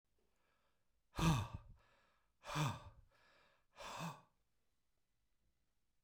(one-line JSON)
{"exhalation_length": "6.0 s", "exhalation_amplitude": 2371, "exhalation_signal_mean_std_ratio": 0.31, "survey_phase": "beta (2021-08-13 to 2022-03-07)", "age": "45-64", "gender": "Male", "wearing_mask": "No", "symptom_cough_any": true, "smoker_status": "Never smoked", "respiratory_condition_asthma": false, "respiratory_condition_other": false, "recruitment_source": "REACT", "submission_delay": "0 days", "covid_test_result": "Negative", "covid_test_method": "RT-qPCR"}